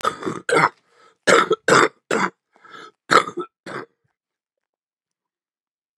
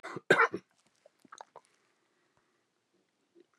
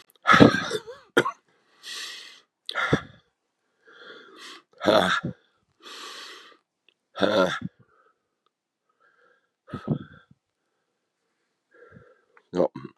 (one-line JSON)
{"three_cough_length": "6.0 s", "three_cough_amplitude": 32768, "three_cough_signal_mean_std_ratio": 0.35, "cough_length": "3.6 s", "cough_amplitude": 12110, "cough_signal_mean_std_ratio": 0.2, "exhalation_length": "13.0 s", "exhalation_amplitude": 32768, "exhalation_signal_mean_std_ratio": 0.29, "survey_phase": "beta (2021-08-13 to 2022-03-07)", "age": "65+", "gender": "Male", "wearing_mask": "No", "symptom_new_continuous_cough": true, "symptom_runny_or_blocked_nose": true, "symptom_sore_throat": true, "symptom_fatigue": true, "symptom_headache": true, "symptom_onset": "3 days", "smoker_status": "Never smoked", "respiratory_condition_asthma": false, "respiratory_condition_other": true, "recruitment_source": "Test and Trace", "submission_delay": "1 day", "covid_test_result": "Positive", "covid_test_method": "RT-qPCR", "covid_ct_value": 17.0, "covid_ct_gene": "S gene", "covid_ct_mean": 18.4, "covid_viral_load": "950000 copies/ml", "covid_viral_load_category": "Low viral load (10K-1M copies/ml)"}